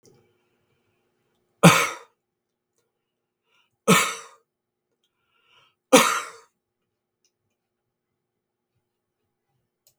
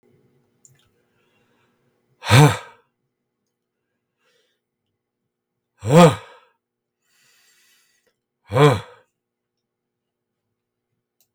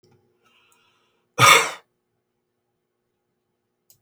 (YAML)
three_cough_length: 10.0 s
three_cough_amplitude: 32768
three_cough_signal_mean_std_ratio: 0.2
exhalation_length: 11.3 s
exhalation_amplitude: 32766
exhalation_signal_mean_std_ratio: 0.2
cough_length: 4.0 s
cough_amplitude: 32306
cough_signal_mean_std_ratio: 0.21
survey_phase: beta (2021-08-13 to 2022-03-07)
age: 65+
gender: Male
wearing_mask: 'No'
symptom_none: true
smoker_status: Never smoked
respiratory_condition_asthma: false
respiratory_condition_other: false
recruitment_source: REACT
submission_delay: 2 days
covid_test_result: Negative
covid_test_method: RT-qPCR